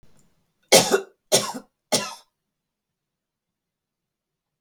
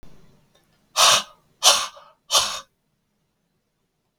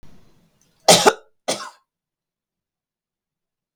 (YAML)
three_cough_length: 4.6 s
three_cough_amplitude: 32768
three_cough_signal_mean_std_ratio: 0.25
exhalation_length: 4.2 s
exhalation_amplitude: 32768
exhalation_signal_mean_std_ratio: 0.32
cough_length: 3.8 s
cough_amplitude: 32768
cough_signal_mean_std_ratio: 0.22
survey_phase: beta (2021-08-13 to 2022-03-07)
age: 65+
gender: Female
wearing_mask: 'No'
symptom_none: true
smoker_status: Ex-smoker
respiratory_condition_asthma: false
respiratory_condition_other: false
recruitment_source: REACT
submission_delay: 2 days
covid_test_result: Negative
covid_test_method: RT-qPCR